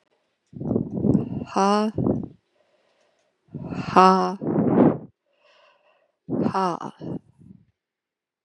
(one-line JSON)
{"exhalation_length": "8.4 s", "exhalation_amplitude": 32332, "exhalation_signal_mean_std_ratio": 0.44, "survey_phase": "beta (2021-08-13 to 2022-03-07)", "age": "18-44", "gender": "Female", "wearing_mask": "No", "symptom_cough_any": true, "symptom_runny_or_blocked_nose": true, "symptom_fatigue": true, "smoker_status": "Current smoker (1 to 10 cigarettes per day)", "respiratory_condition_asthma": false, "respiratory_condition_other": false, "recruitment_source": "Test and Trace", "submission_delay": "2 days", "covid_test_result": "Positive", "covid_test_method": "LFT"}